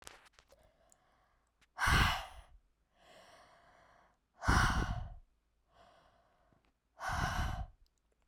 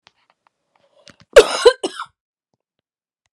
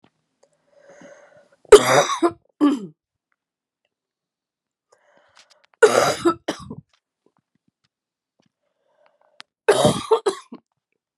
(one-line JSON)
{"exhalation_length": "8.3 s", "exhalation_amplitude": 5398, "exhalation_signal_mean_std_ratio": 0.37, "cough_length": "3.3 s", "cough_amplitude": 32768, "cough_signal_mean_std_ratio": 0.21, "three_cough_length": "11.2 s", "three_cough_amplitude": 32768, "three_cough_signal_mean_std_ratio": 0.27, "survey_phase": "beta (2021-08-13 to 2022-03-07)", "age": "18-44", "gender": "Female", "wearing_mask": "No", "symptom_cough_any": true, "symptom_runny_or_blocked_nose": true, "symptom_sore_throat": true, "symptom_fatigue": true, "symptom_headache": true, "symptom_change_to_sense_of_smell_or_taste": true, "symptom_loss_of_taste": true, "symptom_onset": "8 days", "smoker_status": "Never smoked", "respiratory_condition_asthma": false, "respiratory_condition_other": false, "recruitment_source": "Test and Trace", "submission_delay": "2 days", "covid_test_result": "Positive", "covid_test_method": "RT-qPCR", "covid_ct_value": 25.0, "covid_ct_gene": "ORF1ab gene"}